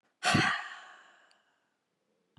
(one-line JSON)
{"exhalation_length": "2.4 s", "exhalation_amplitude": 7150, "exhalation_signal_mean_std_ratio": 0.35, "survey_phase": "beta (2021-08-13 to 2022-03-07)", "age": "65+", "gender": "Female", "wearing_mask": "No", "symptom_none": true, "symptom_onset": "3 days", "smoker_status": "Never smoked", "respiratory_condition_asthma": false, "respiratory_condition_other": false, "recruitment_source": "REACT", "submission_delay": "3 days", "covid_test_result": "Negative", "covid_test_method": "RT-qPCR", "influenza_a_test_result": "Negative", "influenza_b_test_result": "Negative"}